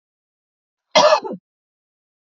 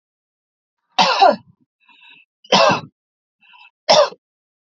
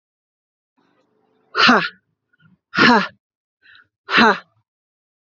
{
  "cough_length": "2.4 s",
  "cough_amplitude": 29836,
  "cough_signal_mean_std_ratio": 0.28,
  "three_cough_length": "4.7 s",
  "three_cough_amplitude": 30720,
  "three_cough_signal_mean_std_ratio": 0.34,
  "exhalation_length": "5.2 s",
  "exhalation_amplitude": 32767,
  "exhalation_signal_mean_std_ratio": 0.32,
  "survey_phase": "alpha (2021-03-01 to 2021-08-12)",
  "age": "45-64",
  "gender": "Female",
  "wearing_mask": "No",
  "symptom_none": true,
  "smoker_status": "Ex-smoker",
  "respiratory_condition_asthma": false,
  "respiratory_condition_other": false,
  "recruitment_source": "REACT",
  "submission_delay": "2 days",
  "covid_test_result": "Negative",
  "covid_test_method": "RT-qPCR"
}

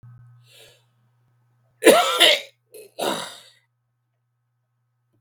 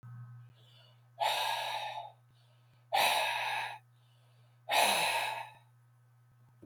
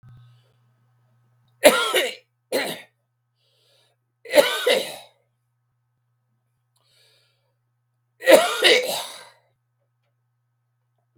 {
  "cough_length": "5.2 s",
  "cough_amplitude": 32768,
  "cough_signal_mean_std_ratio": 0.28,
  "exhalation_length": "6.7 s",
  "exhalation_amplitude": 7521,
  "exhalation_signal_mean_std_ratio": 0.53,
  "three_cough_length": "11.2 s",
  "three_cough_amplitude": 32768,
  "three_cough_signal_mean_std_ratio": 0.29,
  "survey_phase": "beta (2021-08-13 to 2022-03-07)",
  "age": "65+",
  "gender": "Male",
  "wearing_mask": "No",
  "symptom_cough_any": true,
  "symptom_shortness_of_breath": true,
  "smoker_status": "Ex-smoker",
  "respiratory_condition_asthma": false,
  "respiratory_condition_other": false,
  "recruitment_source": "REACT",
  "submission_delay": "3 days",
  "covid_test_result": "Negative",
  "covid_test_method": "RT-qPCR",
  "influenza_a_test_result": "Unknown/Void",
  "influenza_b_test_result": "Unknown/Void"
}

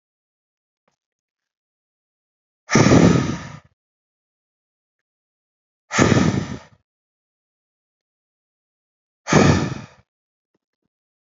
{
  "exhalation_length": "11.3 s",
  "exhalation_amplitude": 32282,
  "exhalation_signal_mean_std_ratio": 0.29,
  "survey_phase": "beta (2021-08-13 to 2022-03-07)",
  "age": "45-64",
  "gender": "Male",
  "wearing_mask": "No",
  "symptom_loss_of_taste": true,
  "symptom_onset": "3 days",
  "smoker_status": "Never smoked",
  "respiratory_condition_asthma": false,
  "respiratory_condition_other": false,
  "recruitment_source": "Test and Trace",
  "submission_delay": "2 days",
  "covid_test_result": "Positive",
  "covid_test_method": "RT-qPCR"
}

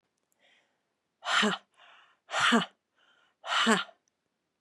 {
  "exhalation_length": "4.6 s",
  "exhalation_amplitude": 13335,
  "exhalation_signal_mean_std_ratio": 0.37,
  "survey_phase": "beta (2021-08-13 to 2022-03-07)",
  "age": "45-64",
  "gender": "Female",
  "wearing_mask": "No",
  "symptom_none": true,
  "smoker_status": "Ex-smoker",
  "respiratory_condition_asthma": false,
  "respiratory_condition_other": false,
  "recruitment_source": "REACT",
  "submission_delay": "1 day",
  "covid_test_result": "Negative",
  "covid_test_method": "RT-qPCR"
}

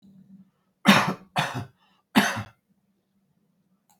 {
  "three_cough_length": "4.0 s",
  "three_cough_amplitude": 24693,
  "three_cough_signal_mean_std_ratio": 0.31,
  "survey_phase": "beta (2021-08-13 to 2022-03-07)",
  "age": "65+",
  "gender": "Male",
  "wearing_mask": "No",
  "symptom_none": true,
  "smoker_status": "Current smoker (11 or more cigarettes per day)",
  "respiratory_condition_asthma": false,
  "respiratory_condition_other": false,
  "recruitment_source": "REACT",
  "submission_delay": "2 days",
  "covid_test_result": "Negative",
  "covid_test_method": "RT-qPCR"
}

